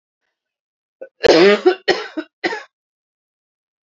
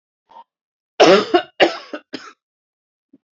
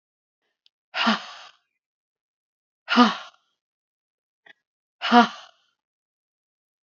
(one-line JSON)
{"cough_length": "3.8 s", "cough_amplitude": 32767, "cough_signal_mean_std_ratio": 0.33, "three_cough_length": "3.3 s", "three_cough_amplitude": 29066, "three_cough_signal_mean_std_ratio": 0.3, "exhalation_length": "6.8 s", "exhalation_amplitude": 24990, "exhalation_signal_mean_std_ratio": 0.24, "survey_phase": "beta (2021-08-13 to 2022-03-07)", "age": "45-64", "gender": "Female", "wearing_mask": "Yes", "symptom_runny_or_blocked_nose": true, "symptom_headache": true, "symptom_loss_of_taste": true, "symptom_onset": "5 days", "smoker_status": "Never smoked", "respiratory_condition_asthma": false, "respiratory_condition_other": false, "recruitment_source": "Test and Trace", "submission_delay": "2 days", "covid_test_result": "Positive", "covid_test_method": "RT-qPCR", "covid_ct_value": 18.3, "covid_ct_gene": "N gene", "covid_ct_mean": 18.8, "covid_viral_load": "700000 copies/ml", "covid_viral_load_category": "Low viral load (10K-1M copies/ml)"}